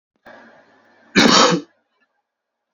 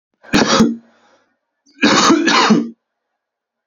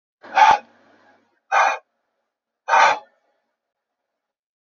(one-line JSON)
{"cough_length": "2.7 s", "cough_amplitude": 32086, "cough_signal_mean_std_ratio": 0.34, "three_cough_length": "3.7 s", "three_cough_amplitude": 30637, "three_cough_signal_mean_std_ratio": 0.51, "exhalation_length": "4.7 s", "exhalation_amplitude": 27782, "exhalation_signal_mean_std_ratio": 0.32, "survey_phase": "beta (2021-08-13 to 2022-03-07)", "age": "18-44", "gender": "Male", "wearing_mask": "No", "symptom_fatigue": true, "symptom_loss_of_taste": true, "symptom_onset": "3 days", "smoker_status": "Prefer not to say", "respiratory_condition_asthma": false, "respiratory_condition_other": false, "recruitment_source": "Test and Trace", "submission_delay": "2 days", "covid_test_result": "Positive", "covid_test_method": "ePCR"}